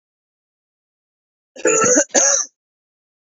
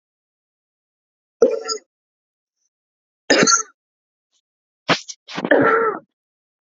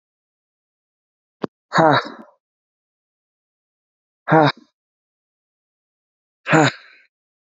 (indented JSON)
{
  "cough_length": "3.2 s",
  "cough_amplitude": 32748,
  "cough_signal_mean_std_ratio": 0.39,
  "three_cough_length": "6.7 s",
  "three_cough_amplitude": 30815,
  "three_cough_signal_mean_std_ratio": 0.33,
  "exhalation_length": "7.6 s",
  "exhalation_amplitude": 27509,
  "exhalation_signal_mean_std_ratio": 0.24,
  "survey_phase": "beta (2021-08-13 to 2022-03-07)",
  "age": "18-44",
  "gender": "Male",
  "wearing_mask": "No",
  "symptom_none": true,
  "smoker_status": "Never smoked",
  "respiratory_condition_asthma": false,
  "respiratory_condition_other": false,
  "recruitment_source": "REACT",
  "submission_delay": "1 day",
  "covid_test_result": "Negative",
  "covid_test_method": "RT-qPCR",
  "influenza_a_test_result": "Negative",
  "influenza_b_test_result": "Negative"
}